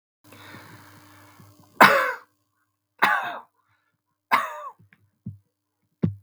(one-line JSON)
{"three_cough_length": "6.2 s", "three_cough_amplitude": 32768, "three_cough_signal_mean_std_ratio": 0.28, "survey_phase": "beta (2021-08-13 to 2022-03-07)", "age": "65+", "gender": "Male", "wearing_mask": "No", "symptom_none": true, "smoker_status": "Never smoked", "respiratory_condition_asthma": false, "respiratory_condition_other": false, "recruitment_source": "REACT", "submission_delay": "1 day", "covid_test_result": "Negative", "covid_test_method": "RT-qPCR"}